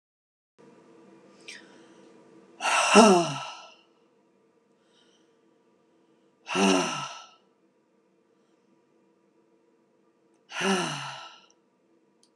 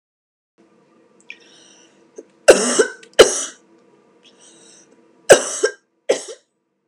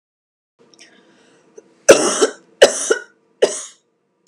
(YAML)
exhalation_length: 12.4 s
exhalation_amplitude: 26032
exhalation_signal_mean_std_ratio: 0.28
cough_length: 6.9 s
cough_amplitude: 32768
cough_signal_mean_std_ratio: 0.25
three_cough_length: 4.3 s
three_cough_amplitude: 32768
three_cough_signal_mean_std_ratio: 0.29
survey_phase: beta (2021-08-13 to 2022-03-07)
age: 18-44
gender: Female
wearing_mask: 'No'
symptom_none: true
smoker_status: Never smoked
respiratory_condition_asthma: true
respiratory_condition_other: false
recruitment_source: REACT
submission_delay: 3 days
covid_test_result: Negative
covid_test_method: RT-qPCR